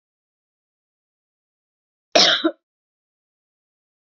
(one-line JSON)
{"cough_length": "4.2 s", "cough_amplitude": 32768, "cough_signal_mean_std_ratio": 0.21, "survey_phase": "beta (2021-08-13 to 2022-03-07)", "age": "18-44", "gender": "Female", "wearing_mask": "No", "symptom_cough_any": true, "symptom_sore_throat": true, "symptom_fatigue": true, "symptom_headache": true, "symptom_change_to_sense_of_smell_or_taste": true, "smoker_status": "Never smoked", "respiratory_condition_asthma": false, "respiratory_condition_other": false, "recruitment_source": "Test and Trace", "submission_delay": "2 days", "covid_test_result": "Positive", "covid_test_method": "RT-qPCR", "covid_ct_value": 31.3, "covid_ct_gene": "ORF1ab gene"}